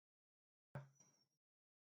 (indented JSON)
{
  "cough_length": "1.9 s",
  "cough_amplitude": 345,
  "cough_signal_mean_std_ratio": 0.22,
  "survey_phase": "beta (2021-08-13 to 2022-03-07)",
  "age": "45-64",
  "gender": "Male",
  "wearing_mask": "No",
  "symptom_fatigue": true,
  "smoker_status": "Never smoked",
  "respiratory_condition_asthma": false,
  "respiratory_condition_other": true,
  "recruitment_source": "REACT",
  "submission_delay": "0 days",
  "covid_test_result": "Negative",
  "covid_test_method": "RT-qPCR"
}